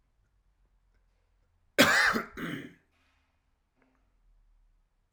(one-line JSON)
{"cough_length": "5.1 s", "cough_amplitude": 15061, "cough_signal_mean_std_ratio": 0.26, "survey_phase": "alpha (2021-03-01 to 2021-08-12)", "age": "45-64", "gender": "Male", "wearing_mask": "No", "symptom_cough_any": true, "symptom_fatigue": true, "symptom_headache": true, "symptom_change_to_sense_of_smell_or_taste": true, "symptom_loss_of_taste": true, "symptom_onset": "6 days", "smoker_status": "Never smoked", "respiratory_condition_asthma": false, "respiratory_condition_other": false, "recruitment_source": "Test and Trace", "submission_delay": "1 day", "covid_test_result": "Positive", "covid_test_method": "RT-qPCR"}